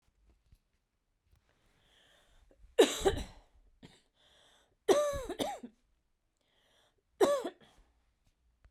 {
  "three_cough_length": "8.7 s",
  "three_cough_amplitude": 8407,
  "three_cough_signal_mean_std_ratio": 0.27,
  "survey_phase": "beta (2021-08-13 to 2022-03-07)",
  "age": "45-64",
  "gender": "Female",
  "wearing_mask": "No",
  "symptom_none": true,
  "smoker_status": "Never smoked",
  "respiratory_condition_asthma": true,
  "respiratory_condition_other": false,
  "recruitment_source": "REACT",
  "submission_delay": "2 days",
  "covid_test_result": "Negative",
  "covid_test_method": "RT-qPCR"
}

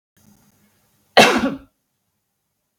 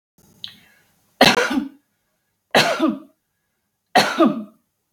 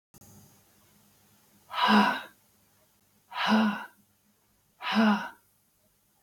{
  "cough_length": "2.8 s",
  "cough_amplitude": 32768,
  "cough_signal_mean_std_ratio": 0.26,
  "three_cough_length": "4.9 s",
  "three_cough_amplitude": 32768,
  "three_cough_signal_mean_std_ratio": 0.38,
  "exhalation_length": "6.2 s",
  "exhalation_amplitude": 11150,
  "exhalation_signal_mean_std_ratio": 0.38,
  "survey_phase": "beta (2021-08-13 to 2022-03-07)",
  "age": "45-64",
  "gender": "Female",
  "wearing_mask": "No",
  "symptom_sore_throat": true,
  "symptom_fatigue": true,
  "symptom_onset": "8 days",
  "smoker_status": "Never smoked",
  "respiratory_condition_asthma": false,
  "respiratory_condition_other": false,
  "recruitment_source": "REACT",
  "submission_delay": "0 days",
  "covid_test_result": "Negative",
  "covid_test_method": "RT-qPCR",
  "influenza_a_test_result": "Unknown/Void",
  "influenza_b_test_result": "Unknown/Void"
}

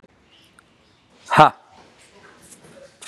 {
  "exhalation_length": "3.1 s",
  "exhalation_amplitude": 32768,
  "exhalation_signal_mean_std_ratio": 0.19,
  "survey_phase": "beta (2021-08-13 to 2022-03-07)",
  "age": "18-44",
  "gender": "Male",
  "wearing_mask": "No",
  "symptom_none": true,
  "symptom_onset": "12 days",
  "smoker_status": "Never smoked",
  "respiratory_condition_asthma": false,
  "respiratory_condition_other": false,
  "recruitment_source": "REACT",
  "submission_delay": "3 days",
  "covid_test_result": "Negative",
  "covid_test_method": "RT-qPCR",
  "influenza_a_test_result": "Negative",
  "influenza_b_test_result": "Negative"
}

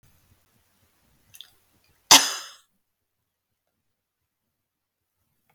{
  "cough_length": "5.5 s",
  "cough_amplitude": 32768,
  "cough_signal_mean_std_ratio": 0.13,
  "survey_phase": "beta (2021-08-13 to 2022-03-07)",
  "age": "65+",
  "gender": "Female",
  "wearing_mask": "No",
  "symptom_none": true,
  "smoker_status": "Never smoked",
  "respiratory_condition_asthma": false,
  "respiratory_condition_other": false,
  "recruitment_source": "REACT",
  "submission_delay": "3 days",
  "covid_test_result": "Negative",
  "covid_test_method": "RT-qPCR",
  "influenza_a_test_result": "Negative",
  "influenza_b_test_result": "Negative"
}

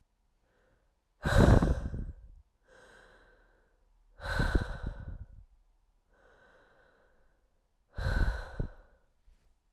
{
  "exhalation_length": "9.7 s",
  "exhalation_amplitude": 12611,
  "exhalation_signal_mean_std_ratio": 0.33,
  "survey_phase": "beta (2021-08-13 to 2022-03-07)",
  "age": "18-44",
  "gender": "Female",
  "wearing_mask": "No",
  "symptom_cough_any": true,
  "symptom_new_continuous_cough": true,
  "symptom_runny_or_blocked_nose": true,
  "symptom_fatigue": true,
  "symptom_onset": "2 days",
  "smoker_status": "Ex-smoker",
  "respiratory_condition_asthma": false,
  "respiratory_condition_other": false,
  "recruitment_source": "Test and Trace",
  "submission_delay": "1 day",
  "covid_test_result": "Positive",
  "covid_test_method": "RT-qPCR",
  "covid_ct_value": 20.9,
  "covid_ct_gene": "ORF1ab gene",
  "covid_ct_mean": 20.9,
  "covid_viral_load": "140000 copies/ml",
  "covid_viral_load_category": "Low viral load (10K-1M copies/ml)"
}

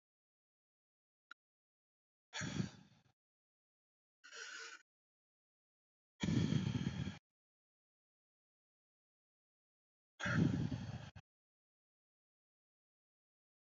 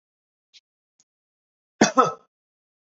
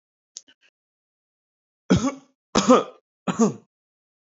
{
  "exhalation_length": "13.7 s",
  "exhalation_amplitude": 2589,
  "exhalation_signal_mean_std_ratio": 0.3,
  "cough_length": "2.9 s",
  "cough_amplitude": 26333,
  "cough_signal_mean_std_ratio": 0.2,
  "three_cough_length": "4.3 s",
  "three_cough_amplitude": 26658,
  "three_cough_signal_mean_std_ratio": 0.3,
  "survey_phase": "beta (2021-08-13 to 2022-03-07)",
  "age": "18-44",
  "gender": "Male",
  "wearing_mask": "No",
  "symptom_none": true,
  "symptom_onset": "7 days",
  "smoker_status": "Ex-smoker",
  "respiratory_condition_asthma": false,
  "respiratory_condition_other": false,
  "recruitment_source": "REACT",
  "submission_delay": "1 day",
  "covid_test_result": "Negative",
  "covid_test_method": "RT-qPCR"
}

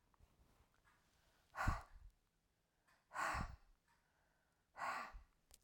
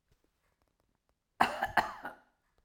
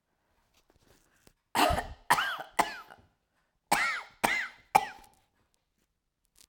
{
  "exhalation_length": "5.6 s",
  "exhalation_amplitude": 1840,
  "exhalation_signal_mean_std_ratio": 0.36,
  "cough_length": "2.6 s",
  "cough_amplitude": 9903,
  "cough_signal_mean_std_ratio": 0.28,
  "three_cough_length": "6.5 s",
  "three_cough_amplitude": 15384,
  "three_cough_signal_mean_std_ratio": 0.34,
  "survey_phase": "beta (2021-08-13 to 2022-03-07)",
  "age": "65+",
  "gender": "Female",
  "wearing_mask": "No",
  "symptom_cough_any": true,
  "symptom_runny_or_blocked_nose": true,
  "smoker_status": "Never smoked",
  "respiratory_condition_asthma": false,
  "respiratory_condition_other": false,
  "recruitment_source": "REACT",
  "submission_delay": "2 days",
  "covid_test_result": "Negative",
  "covid_test_method": "RT-qPCR",
  "influenza_a_test_result": "Negative",
  "influenza_b_test_result": "Negative"
}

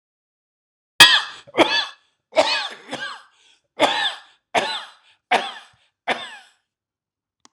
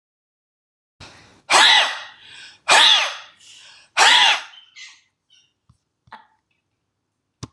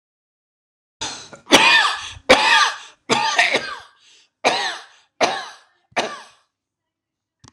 {
  "cough_length": "7.5 s",
  "cough_amplitude": 26028,
  "cough_signal_mean_std_ratio": 0.34,
  "exhalation_length": "7.5 s",
  "exhalation_amplitude": 26028,
  "exhalation_signal_mean_std_ratio": 0.35,
  "three_cough_length": "7.5 s",
  "three_cough_amplitude": 26028,
  "three_cough_signal_mean_std_ratio": 0.42,
  "survey_phase": "alpha (2021-03-01 to 2021-08-12)",
  "age": "65+",
  "gender": "Male",
  "wearing_mask": "No",
  "symptom_none": true,
  "smoker_status": "Ex-smoker",
  "respiratory_condition_asthma": false,
  "respiratory_condition_other": false,
  "recruitment_source": "REACT",
  "submission_delay": "16 days",
  "covid_test_result": "Negative",
  "covid_test_method": "RT-qPCR"
}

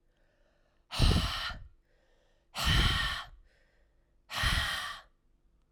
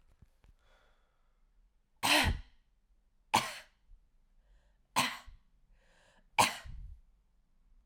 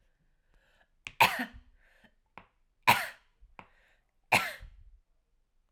{
  "exhalation_length": "5.7 s",
  "exhalation_amplitude": 7003,
  "exhalation_signal_mean_std_ratio": 0.46,
  "three_cough_length": "7.9 s",
  "three_cough_amplitude": 8016,
  "three_cough_signal_mean_std_ratio": 0.29,
  "cough_length": "5.7 s",
  "cough_amplitude": 12118,
  "cough_signal_mean_std_ratio": 0.24,
  "survey_phase": "alpha (2021-03-01 to 2021-08-12)",
  "age": "18-44",
  "gender": "Female",
  "wearing_mask": "No",
  "symptom_fatigue": true,
  "symptom_fever_high_temperature": true,
  "symptom_headache": true,
  "smoker_status": "Ex-smoker",
  "respiratory_condition_asthma": false,
  "respiratory_condition_other": false,
  "recruitment_source": "Test and Trace",
  "submission_delay": "2 days",
  "covid_test_result": "Positive",
  "covid_test_method": "RT-qPCR",
  "covid_ct_value": 19.9,
  "covid_ct_gene": "ORF1ab gene",
  "covid_ct_mean": 21.3,
  "covid_viral_load": "110000 copies/ml",
  "covid_viral_load_category": "Low viral load (10K-1M copies/ml)"
}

